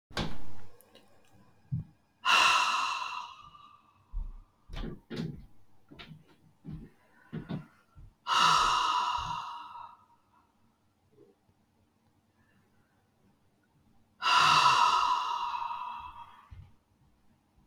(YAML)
exhalation_length: 17.7 s
exhalation_amplitude: 9472
exhalation_signal_mean_std_ratio: 0.46
survey_phase: beta (2021-08-13 to 2022-03-07)
age: 45-64
gender: Female
wearing_mask: 'No'
symptom_cough_any: true
symptom_new_continuous_cough: true
symptom_runny_or_blocked_nose: true
symptom_shortness_of_breath: true
symptom_fatigue: true
symptom_onset: 3 days
smoker_status: Never smoked
respiratory_condition_asthma: false
respiratory_condition_other: true
recruitment_source: Test and Trace
submission_delay: 2 days
covid_test_result: Negative
covid_test_method: RT-qPCR